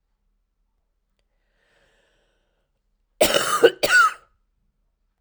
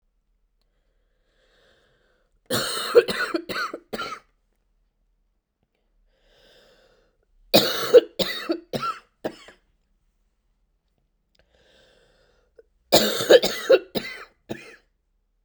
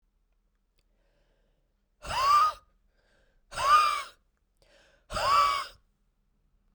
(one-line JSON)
{"cough_length": "5.2 s", "cough_amplitude": 31677, "cough_signal_mean_std_ratio": 0.28, "three_cough_length": "15.4 s", "three_cough_amplitude": 29375, "three_cough_signal_mean_std_ratio": 0.27, "exhalation_length": "6.7 s", "exhalation_amplitude": 8972, "exhalation_signal_mean_std_ratio": 0.38, "survey_phase": "beta (2021-08-13 to 2022-03-07)", "age": "45-64", "gender": "Female", "wearing_mask": "No", "symptom_cough_any": true, "symptom_new_continuous_cough": true, "symptom_shortness_of_breath": true, "symptom_fatigue": true, "symptom_headache": true, "symptom_change_to_sense_of_smell_or_taste": true, "symptom_loss_of_taste": true, "symptom_onset": "5 days", "smoker_status": "Never smoked", "respiratory_condition_asthma": true, "respiratory_condition_other": false, "recruitment_source": "Test and Trace", "submission_delay": "2 days", "covid_test_result": "Positive", "covid_test_method": "RT-qPCR", "covid_ct_value": 27.1, "covid_ct_gene": "ORF1ab gene"}